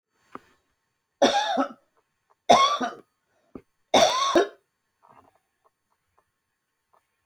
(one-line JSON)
{"three_cough_length": "7.3 s", "three_cough_amplitude": 22427, "three_cough_signal_mean_std_ratio": 0.33, "survey_phase": "beta (2021-08-13 to 2022-03-07)", "age": "65+", "gender": "Female", "wearing_mask": "No", "symptom_cough_any": true, "symptom_runny_or_blocked_nose": true, "symptom_onset": "5 days", "smoker_status": "Ex-smoker", "respiratory_condition_asthma": false, "respiratory_condition_other": false, "recruitment_source": "REACT", "submission_delay": "7 days", "covid_test_result": "Negative", "covid_test_method": "RT-qPCR"}